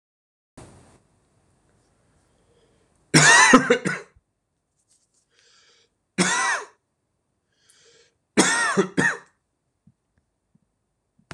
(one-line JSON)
{"three_cough_length": "11.3 s", "three_cough_amplitude": 26028, "three_cough_signal_mean_std_ratio": 0.3, "survey_phase": "beta (2021-08-13 to 2022-03-07)", "age": "18-44", "gender": "Male", "wearing_mask": "No", "symptom_none": true, "smoker_status": "Never smoked", "respiratory_condition_asthma": false, "respiratory_condition_other": false, "recruitment_source": "REACT", "submission_delay": "6 days", "covid_test_result": "Negative", "covid_test_method": "RT-qPCR", "influenza_a_test_result": "Negative", "influenza_b_test_result": "Negative"}